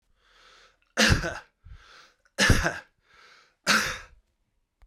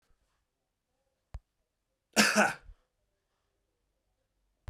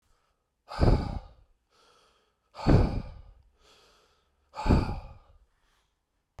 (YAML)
three_cough_length: 4.9 s
three_cough_amplitude: 16242
three_cough_signal_mean_std_ratio: 0.36
cough_length: 4.7 s
cough_amplitude: 12164
cough_signal_mean_std_ratio: 0.22
exhalation_length: 6.4 s
exhalation_amplitude: 12561
exhalation_signal_mean_std_ratio: 0.33
survey_phase: beta (2021-08-13 to 2022-03-07)
age: 45-64
gender: Male
wearing_mask: 'No'
symptom_cough_any: true
symptom_runny_or_blocked_nose: true
symptom_sore_throat: true
symptom_onset: 2 days
smoker_status: Ex-smoker
respiratory_condition_asthma: false
respiratory_condition_other: false
recruitment_source: Test and Trace
submission_delay: 1 day
covid_test_result: Positive
covid_test_method: ePCR